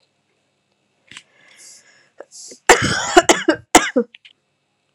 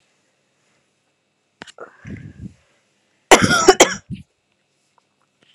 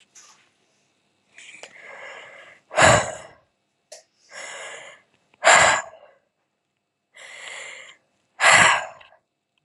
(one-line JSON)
{"three_cough_length": "4.9 s", "three_cough_amplitude": 32768, "three_cough_signal_mean_std_ratio": 0.29, "cough_length": "5.5 s", "cough_amplitude": 32768, "cough_signal_mean_std_ratio": 0.23, "exhalation_length": "9.6 s", "exhalation_amplitude": 29161, "exhalation_signal_mean_std_ratio": 0.31, "survey_phase": "alpha (2021-03-01 to 2021-08-12)", "age": "18-44", "gender": "Female", "wearing_mask": "No", "symptom_cough_any": true, "symptom_new_continuous_cough": true, "symptom_shortness_of_breath": true, "symptom_diarrhoea": true, "symptom_fatigue": true, "symptom_fever_high_temperature": true, "symptom_headache": true, "symptom_change_to_sense_of_smell_or_taste": true, "symptom_loss_of_taste": true, "symptom_onset": "8 days", "smoker_status": "Never smoked", "respiratory_condition_asthma": false, "respiratory_condition_other": false, "recruitment_source": "Test and Trace", "submission_delay": "2 days", "covid_test_result": "Positive", "covid_test_method": "RT-qPCR", "covid_ct_value": 19.8, "covid_ct_gene": "N gene", "covid_ct_mean": 19.9, "covid_viral_load": "290000 copies/ml", "covid_viral_load_category": "Low viral load (10K-1M copies/ml)"}